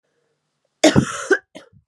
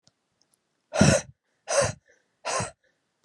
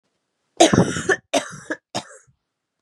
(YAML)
cough_length: 1.9 s
cough_amplitude: 32767
cough_signal_mean_std_ratio: 0.33
exhalation_length: 3.2 s
exhalation_amplitude: 18800
exhalation_signal_mean_std_ratio: 0.34
three_cough_length: 2.8 s
three_cough_amplitude: 32302
three_cough_signal_mean_std_ratio: 0.35
survey_phase: beta (2021-08-13 to 2022-03-07)
age: 18-44
gender: Female
wearing_mask: 'No'
symptom_new_continuous_cough: true
symptom_shortness_of_breath: true
symptom_headache: true
symptom_change_to_sense_of_smell_or_taste: true
symptom_onset: 4 days
smoker_status: Current smoker (e-cigarettes or vapes only)
respiratory_condition_asthma: false
respiratory_condition_other: false
recruitment_source: Test and Trace
submission_delay: 1 day
covid_test_result: Positive
covid_test_method: RT-qPCR
covid_ct_value: 17.7
covid_ct_gene: ORF1ab gene
covid_ct_mean: 18.2
covid_viral_load: 1100000 copies/ml
covid_viral_load_category: High viral load (>1M copies/ml)